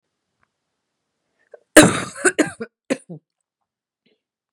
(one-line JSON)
{"cough_length": "4.5 s", "cough_amplitude": 32768, "cough_signal_mean_std_ratio": 0.22, "survey_phase": "beta (2021-08-13 to 2022-03-07)", "age": "18-44", "gender": "Female", "wearing_mask": "No", "symptom_new_continuous_cough": true, "symptom_sore_throat": true, "symptom_fatigue": true, "symptom_fever_high_temperature": true, "smoker_status": "Never smoked", "respiratory_condition_asthma": false, "respiratory_condition_other": false, "recruitment_source": "Test and Trace", "submission_delay": "1 day", "covid_test_result": "Positive", "covid_test_method": "RT-qPCR", "covid_ct_value": 30.5, "covid_ct_gene": "ORF1ab gene"}